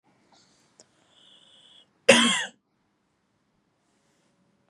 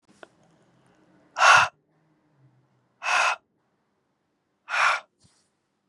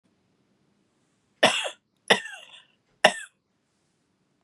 {"cough_length": "4.7 s", "cough_amplitude": 29433, "cough_signal_mean_std_ratio": 0.21, "exhalation_length": "5.9 s", "exhalation_amplitude": 25004, "exhalation_signal_mean_std_ratio": 0.29, "three_cough_length": "4.4 s", "three_cough_amplitude": 32764, "three_cough_signal_mean_std_ratio": 0.22, "survey_phase": "beta (2021-08-13 to 2022-03-07)", "age": "18-44", "gender": "Female", "wearing_mask": "No", "symptom_headache": true, "symptom_onset": "8 days", "smoker_status": "Ex-smoker", "respiratory_condition_asthma": false, "respiratory_condition_other": false, "recruitment_source": "REACT", "submission_delay": "3 days", "covid_test_result": "Negative", "covid_test_method": "RT-qPCR", "influenza_a_test_result": "Negative", "influenza_b_test_result": "Negative"}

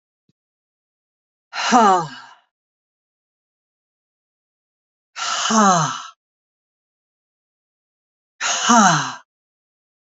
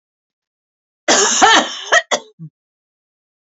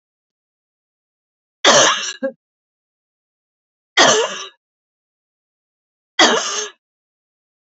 {"exhalation_length": "10.1 s", "exhalation_amplitude": 30456, "exhalation_signal_mean_std_ratio": 0.32, "cough_length": "3.5 s", "cough_amplitude": 32768, "cough_signal_mean_std_ratio": 0.39, "three_cough_length": "7.7 s", "three_cough_amplitude": 31411, "three_cough_signal_mean_std_ratio": 0.31, "survey_phase": "beta (2021-08-13 to 2022-03-07)", "age": "45-64", "gender": "Female", "wearing_mask": "No", "symptom_none": true, "smoker_status": "Ex-smoker", "respiratory_condition_asthma": false, "respiratory_condition_other": false, "recruitment_source": "Test and Trace", "submission_delay": "0 days", "covid_test_result": "Negative", "covid_test_method": "LFT"}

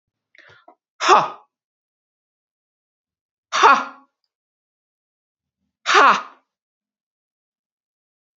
{"exhalation_length": "8.4 s", "exhalation_amplitude": 29250, "exhalation_signal_mean_std_ratio": 0.24, "survey_phase": "beta (2021-08-13 to 2022-03-07)", "age": "65+", "gender": "Female", "wearing_mask": "No", "symptom_none": true, "smoker_status": "Never smoked", "respiratory_condition_asthma": false, "respiratory_condition_other": false, "recruitment_source": "REACT", "submission_delay": "1 day", "covid_test_result": "Negative", "covid_test_method": "RT-qPCR"}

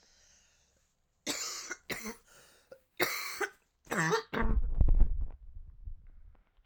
{"three_cough_length": "6.7 s", "three_cough_amplitude": 8838, "three_cough_signal_mean_std_ratio": 0.44, "survey_phase": "alpha (2021-03-01 to 2021-08-12)", "age": "18-44", "gender": "Female", "wearing_mask": "No", "symptom_cough_any": true, "symptom_change_to_sense_of_smell_or_taste": true, "symptom_loss_of_taste": true, "symptom_onset": "6 days", "smoker_status": "Current smoker (1 to 10 cigarettes per day)", "respiratory_condition_asthma": false, "respiratory_condition_other": false, "recruitment_source": "Test and Trace", "submission_delay": "2 days", "covid_test_result": "Positive", "covid_test_method": "RT-qPCR", "covid_ct_value": 18.3, "covid_ct_gene": "ORF1ab gene", "covid_ct_mean": 18.6, "covid_viral_load": "820000 copies/ml", "covid_viral_load_category": "Low viral load (10K-1M copies/ml)"}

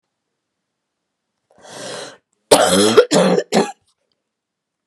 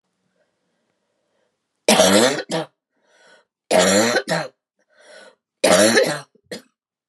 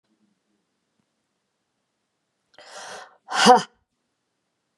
{"cough_length": "4.9 s", "cough_amplitude": 32768, "cough_signal_mean_std_ratio": 0.37, "three_cough_length": "7.1 s", "three_cough_amplitude": 31193, "three_cough_signal_mean_std_ratio": 0.42, "exhalation_length": "4.8 s", "exhalation_amplitude": 28330, "exhalation_signal_mean_std_ratio": 0.2, "survey_phase": "beta (2021-08-13 to 2022-03-07)", "age": "18-44", "gender": "Male", "wearing_mask": "No", "symptom_cough_any": true, "symptom_new_continuous_cough": true, "symptom_onset": "4 days", "smoker_status": "Never smoked", "respiratory_condition_asthma": false, "respiratory_condition_other": false, "recruitment_source": "Test and Trace", "submission_delay": "1 day", "covid_test_result": "Negative", "covid_test_method": "RT-qPCR"}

